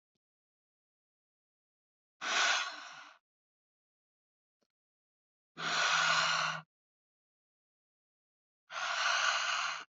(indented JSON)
{
  "exhalation_length": "10.0 s",
  "exhalation_amplitude": 5093,
  "exhalation_signal_mean_std_ratio": 0.42,
  "survey_phase": "beta (2021-08-13 to 2022-03-07)",
  "age": "18-44",
  "gender": "Female",
  "wearing_mask": "No",
  "symptom_none": true,
  "smoker_status": "Never smoked",
  "respiratory_condition_asthma": false,
  "respiratory_condition_other": false,
  "recruitment_source": "REACT",
  "submission_delay": "2 days",
  "covid_test_result": "Negative",
  "covid_test_method": "RT-qPCR"
}